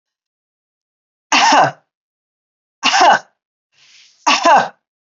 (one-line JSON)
{"three_cough_length": "5.0 s", "three_cough_amplitude": 30081, "three_cough_signal_mean_std_ratio": 0.39, "survey_phase": "beta (2021-08-13 to 2022-03-07)", "age": "65+", "gender": "Female", "wearing_mask": "No", "symptom_none": true, "smoker_status": "Never smoked", "respiratory_condition_asthma": false, "respiratory_condition_other": false, "recruitment_source": "REACT", "submission_delay": "1 day", "covid_test_result": "Negative", "covid_test_method": "RT-qPCR"}